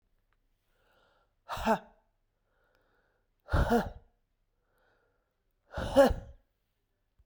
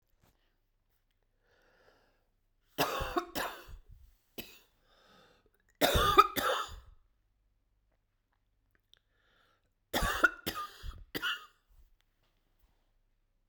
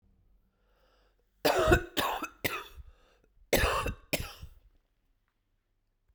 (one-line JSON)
{"exhalation_length": "7.3 s", "exhalation_amplitude": 10343, "exhalation_signal_mean_std_ratio": 0.27, "three_cough_length": "13.5 s", "three_cough_amplitude": 13993, "three_cough_signal_mean_std_ratio": 0.29, "cough_length": "6.1 s", "cough_amplitude": 10180, "cough_signal_mean_std_ratio": 0.37, "survey_phase": "beta (2021-08-13 to 2022-03-07)", "age": "45-64", "gender": "Female", "wearing_mask": "No", "symptom_cough_any": true, "symptom_runny_or_blocked_nose": true, "symptom_sore_throat": true, "symptom_diarrhoea": true, "symptom_fatigue": true, "symptom_fever_high_temperature": true, "symptom_headache": true, "symptom_change_to_sense_of_smell_or_taste": true, "symptom_loss_of_taste": true, "symptom_onset": "3 days", "smoker_status": "Never smoked", "respiratory_condition_asthma": false, "respiratory_condition_other": false, "recruitment_source": "Test and Trace", "submission_delay": "2 days", "covid_test_result": "Positive", "covid_test_method": "RT-qPCR", "covid_ct_value": 15.3, "covid_ct_gene": "ORF1ab gene", "covid_ct_mean": 15.9, "covid_viral_load": "6200000 copies/ml", "covid_viral_load_category": "High viral load (>1M copies/ml)"}